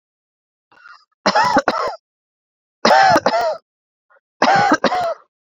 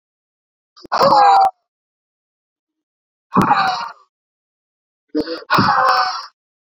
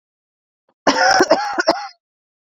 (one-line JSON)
{"three_cough_length": "5.5 s", "three_cough_amplitude": 32767, "three_cough_signal_mean_std_ratio": 0.49, "exhalation_length": "6.7 s", "exhalation_amplitude": 32767, "exhalation_signal_mean_std_ratio": 0.45, "cough_length": "2.6 s", "cough_amplitude": 30925, "cough_signal_mean_std_ratio": 0.45, "survey_phase": "beta (2021-08-13 to 2022-03-07)", "age": "18-44", "gender": "Female", "wearing_mask": "No", "symptom_cough_any": true, "symptom_runny_or_blocked_nose": true, "symptom_shortness_of_breath": true, "symptom_abdominal_pain": true, "symptom_fatigue": true, "symptom_headache": true, "symptom_change_to_sense_of_smell_or_taste": true, "symptom_loss_of_taste": true, "symptom_onset": "8 days", "smoker_status": "Current smoker (e-cigarettes or vapes only)", "respiratory_condition_asthma": false, "respiratory_condition_other": false, "recruitment_source": "Test and Trace", "submission_delay": "2 days", "covid_test_result": "Positive", "covid_test_method": "ePCR"}